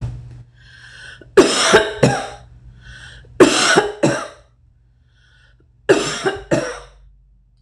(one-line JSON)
{"three_cough_length": "7.6 s", "three_cough_amplitude": 26028, "three_cough_signal_mean_std_ratio": 0.43, "survey_phase": "beta (2021-08-13 to 2022-03-07)", "age": "45-64", "gender": "Female", "wearing_mask": "No", "symptom_none": true, "smoker_status": "Never smoked", "respiratory_condition_asthma": false, "respiratory_condition_other": false, "recruitment_source": "REACT", "submission_delay": "4 days", "covid_test_result": "Negative", "covid_test_method": "RT-qPCR"}